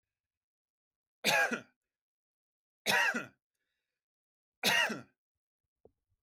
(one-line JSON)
{"three_cough_length": "6.2 s", "three_cough_amplitude": 6121, "three_cough_signal_mean_std_ratio": 0.32, "survey_phase": "beta (2021-08-13 to 2022-03-07)", "age": "18-44", "gender": "Male", "wearing_mask": "No", "symptom_none": true, "smoker_status": "Ex-smoker", "respiratory_condition_asthma": false, "respiratory_condition_other": false, "recruitment_source": "REACT", "submission_delay": "2 days", "covid_test_result": "Negative", "covid_test_method": "RT-qPCR", "influenza_a_test_result": "Negative", "influenza_b_test_result": "Negative"}